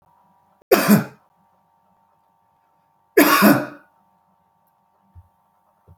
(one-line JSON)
{"cough_length": "6.0 s", "cough_amplitude": 32225, "cough_signal_mean_std_ratio": 0.29, "survey_phase": "beta (2021-08-13 to 2022-03-07)", "age": "65+", "gender": "Male", "wearing_mask": "No", "symptom_none": true, "smoker_status": "Never smoked", "respiratory_condition_asthma": false, "respiratory_condition_other": false, "recruitment_source": "REACT", "submission_delay": "2 days", "covid_test_result": "Negative", "covid_test_method": "RT-qPCR"}